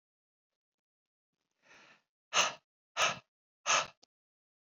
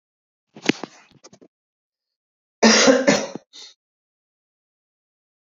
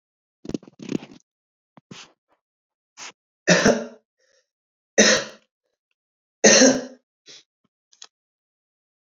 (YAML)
exhalation_length: 4.6 s
exhalation_amplitude: 6279
exhalation_signal_mean_std_ratio: 0.27
cough_length: 5.5 s
cough_amplitude: 32767
cough_signal_mean_std_ratio: 0.27
three_cough_length: 9.1 s
three_cough_amplitude: 32768
three_cough_signal_mean_std_ratio: 0.26
survey_phase: beta (2021-08-13 to 2022-03-07)
age: 18-44
gender: Male
wearing_mask: 'No'
symptom_cough_any: true
symptom_runny_or_blocked_nose: true
symptom_sore_throat: true
symptom_fatigue: true
symptom_fever_high_temperature: true
symptom_headache: true
symptom_change_to_sense_of_smell_or_taste: true
symptom_loss_of_taste: true
symptom_onset: 3 days
smoker_status: Never smoked
respiratory_condition_asthma: true
respiratory_condition_other: false
recruitment_source: Test and Trace
submission_delay: 2 days
covid_test_result: Positive
covid_test_method: RT-qPCR
covid_ct_value: 17.7
covid_ct_gene: E gene